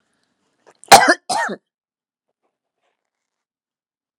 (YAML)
cough_length: 4.2 s
cough_amplitude: 32768
cough_signal_mean_std_ratio: 0.21
survey_phase: alpha (2021-03-01 to 2021-08-12)
age: 45-64
gender: Female
wearing_mask: 'No'
symptom_none: true
smoker_status: Ex-smoker
respiratory_condition_asthma: false
respiratory_condition_other: false
recruitment_source: REACT
submission_delay: 1 day
covid_test_result: Negative
covid_test_method: RT-qPCR